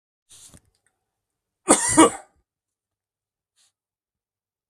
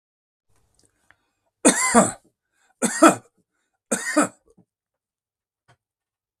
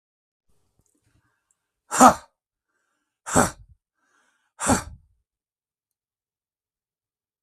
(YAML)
cough_length: 4.7 s
cough_amplitude: 32766
cough_signal_mean_std_ratio: 0.21
three_cough_length: 6.4 s
three_cough_amplitude: 32766
three_cough_signal_mean_std_ratio: 0.27
exhalation_length: 7.4 s
exhalation_amplitude: 32766
exhalation_signal_mean_std_ratio: 0.19
survey_phase: beta (2021-08-13 to 2022-03-07)
age: 65+
gender: Male
wearing_mask: 'No'
symptom_fatigue: true
smoker_status: Ex-smoker
respiratory_condition_asthma: false
respiratory_condition_other: false
recruitment_source: REACT
submission_delay: 1 day
covid_test_result: Negative
covid_test_method: RT-qPCR
influenza_a_test_result: Negative
influenza_b_test_result: Negative